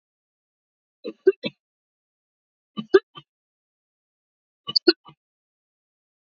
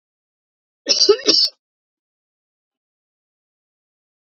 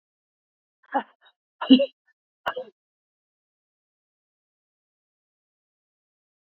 {"three_cough_length": "6.4 s", "three_cough_amplitude": 26291, "three_cough_signal_mean_std_ratio": 0.14, "cough_length": "4.4 s", "cough_amplitude": 31071, "cough_signal_mean_std_ratio": 0.26, "exhalation_length": "6.6 s", "exhalation_amplitude": 25868, "exhalation_signal_mean_std_ratio": 0.15, "survey_phase": "beta (2021-08-13 to 2022-03-07)", "age": "65+", "gender": "Female", "wearing_mask": "No", "symptom_cough_any": true, "symptom_diarrhoea": true, "smoker_status": "Never smoked", "respiratory_condition_asthma": false, "respiratory_condition_other": false, "recruitment_source": "REACT", "submission_delay": "1 day", "covid_test_result": "Negative", "covid_test_method": "RT-qPCR", "influenza_a_test_result": "Negative", "influenza_b_test_result": "Negative"}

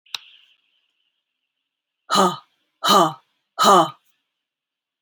{"exhalation_length": "5.0 s", "exhalation_amplitude": 27841, "exhalation_signal_mean_std_ratio": 0.32, "survey_phase": "alpha (2021-03-01 to 2021-08-12)", "age": "45-64", "gender": "Female", "wearing_mask": "No", "symptom_none": true, "smoker_status": "Never smoked", "respiratory_condition_asthma": true, "respiratory_condition_other": false, "recruitment_source": "REACT", "submission_delay": "1 day", "covid_test_result": "Negative", "covid_test_method": "RT-qPCR"}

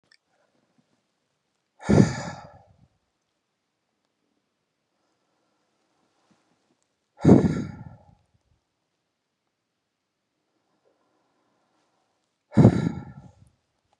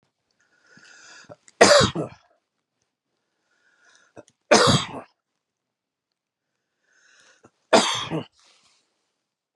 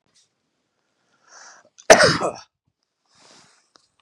{"exhalation_length": "14.0 s", "exhalation_amplitude": 30742, "exhalation_signal_mean_std_ratio": 0.2, "three_cough_length": "9.6 s", "three_cough_amplitude": 32550, "three_cough_signal_mean_std_ratio": 0.26, "cough_length": "4.0 s", "cough_amplitude": 32768, "cough_signal_mean_std_ratio": 0.22, "survey_phase": "beta (2021-08-13 to 2022-03-07)", "age": "45-64", "gender": "Male", "wearing_mask": "No", "symptom_none": true, "smoker_status": "Ex-smoker", "respiratory_condition_asthma": false, "respiratory_condition_other": false, "recruitment_source": "REACT", "submission_delay": "2 days", "covid_test_result": "Negative", "covid_test_method": "RT-qPCR", "influenza_a_test_result": "Negative", "influenza_b_test_result": "Negative"}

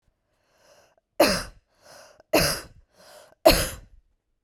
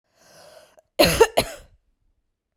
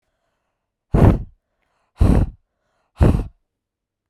{"three_cough_length": "4.4 s", "three_cough_amplitude": 28802, "three_cough_signal_mean_std_ratio": 0.3, "cough_length": "2.6 s", "cough_amplitude": 27951, "cough_signal_mean_std_ratio": 0.28, "exhalation_length": "4.1 s", "exhalation_amplitude": 32768, "exhalation_signal_mean_std_ratio": 0.34, "survey_phase": "beta (2021-08-13 to 2022-03-07)", "age": "18-44", "gender": "Female", "wearing_mask": "No", "symptom_headache": true, "symptom_onset": "12 days", "smoker_status": "Current smoker (11 or more cigarettes per day)", "respiratory_condition_asthma": false, "respiratory_condition_other": false, "recruitment_source": "REACT", "submission_delay": "1 day", "covid_test_result": "Negative", "covid_test_method": "RT-qPCR", "influenza_a_test_result": "Negative", "influenza_b_test_result": "Negative"}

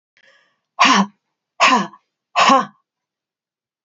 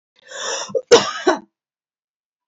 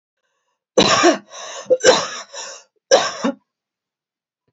{"exhalation_length": "3.8 s", "exhalation_amplitude": 30958, "exhalation_signal_mean_std_ratio": 0.37, "cough_length": "2.5 s", "cough_amplitude": 29441, "cough_signal_mean_std_ratio": 0.34, "three_cough_length": "4.5 s", "three_cough_amplitude": 31655, "three_cough_signal_mean_std_ratio": 0.39, "survey_phase": "beta (2021-08-13 to 2022-03-07)", "age": "45-64", "gender": "Female", "wearing_mask": "No", "symptom_none": true, "smoker_status": "Never smoked", "respiratory_condition_asthma": false, "respiratory_condition_other": false, "recruitment_source": "REACT", "submission_delay": "2 days", "covid_test_result": "Negative", "covid_test_method": "RT-qPCR"}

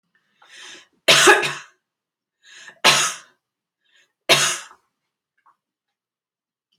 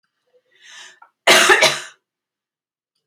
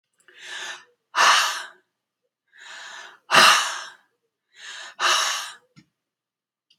{"three_cough_length": "6.8 s", "three_cough_amplitude": 30575, "three_cough_signal_mean_std_ratio": 0.3, "cough_length": "3.1 s", "cough_amplitude": 32767, "cough_signal_mean_std_ratio": 0.33, "exhalation_length": "6.8 s", "exhalation_amplitude": 27598, "exhalation_signal_mean_std_ratio": 0.37, "survey_phase": "beta (2021-08-13 to 2022-03-07)", "age": "65+", "gender": "Female", "wearing_mask": "No", "symptom_fatigue": true, "smoker_status": "Never smoked", "respiratory_condition_asthma": false, "respiratory_condition_other": false, "recruitment_source": "REACT", "submission_delay": "1 day", "covid_test_result": "Negative", "covid_test_method": "RT-qPCR"}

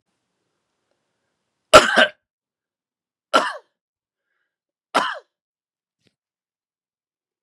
{"three_cough_length": "7.4 s", "three_cough_amplitude": 32768, "three_cough_signal_mean_std_ratio": 0.19, "survey_phase": "beta (2021-08-13 to 2022-03-07)", "age": "45-64", "gender": "Male", "wearing_mask": "No", "symptom_cough_any": true, "symptom_runny_or_blocked_nose": true, "symptom_sore_throat": true, "symptom_fatigue": true, "symptom_headache": true, "symptom_other": true, "symptom_onset": "2 days", "smoker_status": "Never smoked", "respiratory_condition_asthma": false, "respiratory_condition_other": false, "recruitment_source": "Test and Trace", "submission_delay": "1 day", "covid_test_result": "Positive", "covid_test_method": "RT-qPCR", "covid_ct_value": 24.2, "covid_ct_gene": "N gene"}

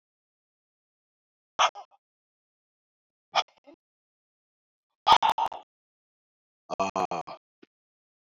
{"exhalation_length": "8.4 s", "exhalation_amplitude": 16142, "exhalation_signal_mean_std_ratio": 0.22, "survey_phase": "beta (2021-08-13 to 2022-03-07)", "age": "45-64", "gender": "Male", "wearing_mask": "No", "symptom_cough_any": true, "symptom_sore_throat": true, "symptom_fatigue": true, "symptom_headache": true, "symptom_other": true, "smoker_status": "Never smoked", "respiratory_condition_asthma": false, "respiratory_condition_other": false, "recruitment_source": "Test and Trace", "submission_delay": "2 days", "covid_test_result": "Positive", "covid_test_method": "RT-qPCR"}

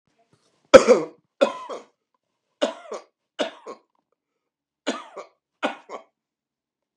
{"three_cough_length": "7.0 s", "three_cough_amplitude": 32768, "three_cough_signal_mean_std_ratio": 0.21, "survey_phase": "beta (2021-08-13 to 2022-03-07)", "age": "65+", "gender": "Male", "wearing_mask": "No", "symptom_cough_any": true, "symptom_runny_or_blocked_nose": true, "symptom_abdominal_pain": true, "symptom_fatigue": true, "symptom_headache": true, "symptom_onset": "6 days", "smoker_status": "Ex-smoker", "respiratory_condition_asthma": false, "respiratory_condition_other": false, "recruitment_source": "REACT", "submission_delay": "1 day", "covid_test_result": "Negative", "covid_test_method": "RT-qPCR", "influenza_a_test_result": "Negative", "influenza_b_test_result": "Negative"}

